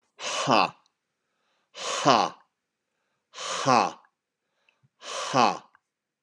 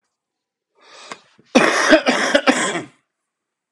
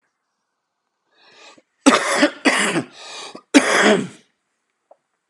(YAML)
exhalation_length: 6.2 s
exhalation_amplitude: 24940
exhalation_signal_mean_std_ratio: 0.36
cough_length: 3.7 s
cough_amplitude: 32767
cough_signal_mean_std_ratio: 0.42
three_cough_length: 5.3 s
three_cough_amplitude: 32768
three_cough_signal_mean_std_ratio: 0.39
survey_phase: beta (2021-08-13 to 2022-03-07)
age: 45-64
gender: Male
wearing_mask: 'No'
symptom_cough_any: true
symptom_runny_or_blocked_nose: true
symptom_shortness_of_breath: true
symptom_sore_throat: true
symptom_fatigue: true
symptom_headache: true
symptom_onset: 3 days
smoker_status: Never smoked
respiratory_condition_asthma: false
respiratory_condition_other: false
recruitment_source: Test and Trace
submission_delay: 2 days
covid_test_result: Positive
covid_test_method: RT-qPCR
covid_ct_value: 18.3
covid_ct_gene: N gene